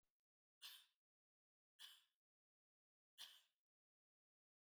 three_cough_length: 4.6 s
three_cough_amplitude: 189
three_cough_signal_mean_std_ratio: 0.27
survey_phase: beta (2021-08-13 to 2022-03-07)
age: 45-64
gender: Female
wearing_mask: 'No'
symptom_none: true
smoker_status: Never smoked
respiratory_condition_asthma: false
respiratory_condition_other: false
recruitment_source: REACT
submission_delay: 4 days
covid_test_result: Negative
covid_test_method: RT-qPCR
influenza_a_test_result: Negative
influenza_b_test_result: Negative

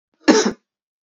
cough_length: 1.0 s
cough_amplitude: 29756
cough_signal_mean_std_ratio: 0.37
survey_phase: beta (2021-08-13 to 2022-03-07)
age: 18-44
gender: Female
wearing_mask: 'No'
symptom_cough_any: true
symptom_runny_or_blocked_nose: true
symptom_change_to_sense_of_smell_or_taste: true
symptom_onset: 5 days
smoker_status: Never smoked
respiratory_condition_asthma: false
respiratory_condition_other: false
recruitment_source: Test and Trace
submission_delay: 2 days
covid_test_result: Positive
covid_test_method: ePCR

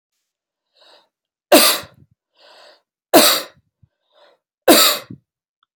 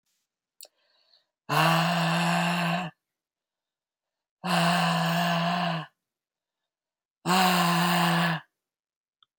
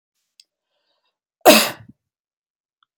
three_cough_length: 5.8 s
three_cough_amplitude: 32768
three_cough_signal_mean_std_ratio: 0.3
exhalation_length: 9.4 s
exhalation_amplitude: 13196
exhalation_signal_mean_std_ratio: 0.59
cough_length: 3.0 s
cough_amplitude: 32768
cough_signal_mean_std_ratio: 0.21
survey_phase: alpha (2021-03-01 to 2021-08-12)
age: 65+
gender: Male
wearing_mask: 'No'
symptom_none: true
smoker_status: Never smoked
respiratory_condition_asthma: false
respiratory_condition_other: false
recruitment_source: REACT
submission_delay: 3 days
covid_test_result: Negative
covid_test_method: RT-qPCR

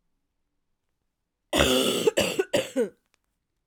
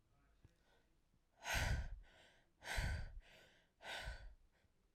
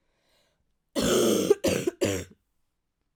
cough_length: 3.7 s
cough_amplitude: 19966
cough_signal_mean_std_ratio: 0.43
exhalation_length: 4.9 s
exhalation_amplitude: 1520
exhalation_signal_mean_std_ratio: 0.47
three_cough_length: 3.2 s
three_cough_amplitude: 13883
three_cough_signal_mean_std_ratio: 0.47
survey_phase: alpha (2021-03-01 to 2021-08-12)
age: 18-44
gender: Female
wearing_mask: 'No'
symptom_new_continuous_cough: true
symptom_shortness_of_breath: true
symptom_fatigue: true
symptom_fever_high_temperature: true
symptom_change_to_sense_of_smell_or_taste: true
symptom_loss_of_taste: true
symptom_onset: 3 days
smoker_status: Prefer not to say
respiratory_condition_asthma: false
respiratory_condition_other: false
recruitment_source: Test and Trace
submission_delay: 1 day
covid_test_result: Positive
covid_test_method: RT-qPCR
covid_ct_value: 17.2
covid_ct_gene: ORF1ab gene
covid_ct_mean: 17.6
covid_viral_load: 1700000 copies/ml
covid_viral_load_category: High viral load (>1M copies/ml)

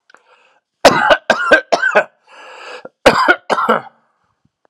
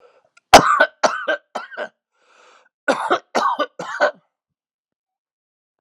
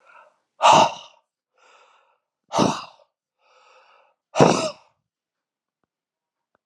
cough_length: 4.7 s
cough_amplitude: 32768
cough_signal_mean_std_ratio: 0.44
three_cough_length: 5.8 s
three_cough_amplitude: 32768
three_cough_signal_mean_std_ratio: 0.33
exhalation_length: 6.7 s
exhalation_amplitude: 31749
exhalation_signal_mean_std_ratio: 0.27
survey_phase: alpha (2021-03-01 to 2021-08-12)
age: 45-64
gender: Male
wearing_mask: 'No'
symptom_cough_any: true
symptom_fatigue: true
symptom_fever_high_temperature: true
symptom_headache: true
symptom_onset: 3 days
smoker_status: Ex-smoker
respiratory_condition_asthma: false
respiratory_condition_other: false
recruitment_source: Test and Trace
submission_delay: 2 days
covid_test_method: RT-qPCR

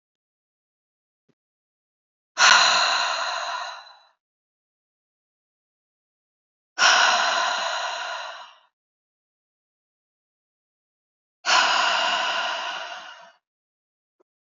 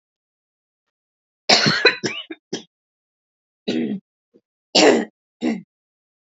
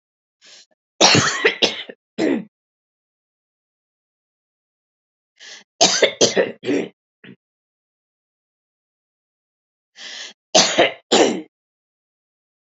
exhalation_length: 14.6 s
exhalation_amplitude: 24812
exhalation_signal_mean_std_ratio: 0.4
cough_length: 6.4 s
cough_amplitude: 32768
cough_signal_mean_std_ratio: 0.34
three_cough_length: 12.7 s
three_cough_amplitude: 32767
three_cough_signal_mean_std_ratio: 0.32
survey_phase: beta (2021-08-13 to 2022-03-07)
age: 45-64
gender: Female
wearing_mask: 'No'
symptom_new_continuous_cough: true
symptom_shortness_of_breath: true
symptom_fatigue: true
smoker_status: Never smoked
respiratory_condition_asthma: false
respiratory_condition_other: false
recruitment_source: REACT
submission_delay: 1 day
covid_test_result: Negative
covid_test_method: RT-qPCR
influenza_a_test_result: Negative
influenza_b_test_result: Negative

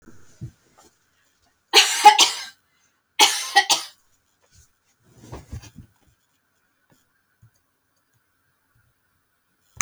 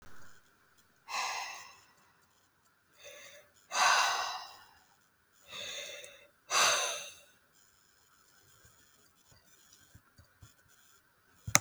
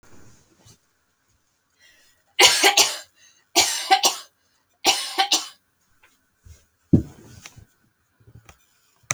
cough_length: 9.8 s
cough_amplitude: 30764
cough_signal_mean_std_ratio: 0.23
exhalation_length: 11.6 s
exhalation_amplitude: 27980
exhalation_signal_mean_std_ratio: 0.33
three_cough_length: 9.1 s
three_cough_amplitude: 30453
three_cough_signal_mean_std_ratio: 0.31
survey_phase: beta (2021-08-13 to 2022-03-07)
age: 18-44
gender: Female
wearing_mask: 'No'
symptom_none: true
smoker_status: Never smoked
respiratory_condition_asthma: false
respiratory_condition_other: false
recruitment_source: REACT
submission_delay: 1 day
covid_test_result: Negative
covid_test_method: RT-qPCR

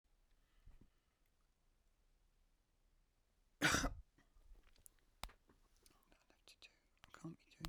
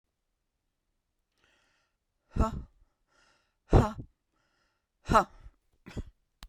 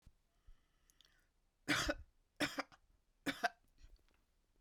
cough_length: 7.7 s
cough_amplitude: 2234
cough_signal_mean_std_ratio: 0.23
exhalation_length: 6.5 s
exhalation_amplitude: 12470
exhalation_signal_mean_std_ratio: 0.22
three_cough_length: 4.6 s
three_cough_amplitude: 2904
three_cough_signal_mean_std_ratio: 0.3
survey_phase: beta (2021-08-13 to 2022-03-07)
age: 65+
gender: Female
wearing_mask: 'No'
symptom_none: true
smoker_status: Never smoked
respiratory_condition_asthma: false
respiratory_condition_other: false
recruitment_source: REACT
submission_delay: 1 day
covid_test_result: Negative
covid_test_method: RT-qPCR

